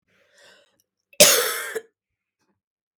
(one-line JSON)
{"cough_length": "3.0 s", "cough_amplitude": 32768, "cough_signal_mean_std_ratio": 0.27, "survey_phase": "beta (2021-08-13 to 2022-03-07)", "age": "18-44", "gender": "Female", "wearing_mask": "No", "symptom_cough_any": true, "symptom_new_continuous_cough": true, "symptom_sore_throat": true, "symptom_fatigue": true, "symptom_fever_high_temperature": true, "symptom_headache": true, "symptom_change_to_sense_of_smell_or_taste": true, "symptom_onset": "2 days", "smoker_status": "Never smoked", "respiratory_condition_asthma": true, "respiratory_condition_other": false, "recruitment_source": "Test and Trace", "submission_delay": "1 day", "covid_test_result": "Positive", "covid_test_method": "ePCR"}